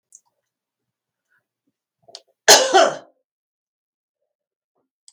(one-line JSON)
{"cough_length": "5.1 s", "cough_amplitude": 32768, "cough_signal_mean_std_ratio": 0.21, "survey_phase": "beta (2021-08-13 to 2022-03-07)", "age": "65+", "gender": "Female", "wearing_mask": "No", "symptom_none": true, "smoker_status": "Ex-smoker", "respiratory_condition_asthma": false, "respiratory_condition_other": false, "recruitment_source": "REACT", "submission_delay": "2 days", "covid_test_result": "Negative", "covid_test_method": "RT-qPCR", "influenza_a_test_result": "Negative", "influenza_b_test_result": "Negative"}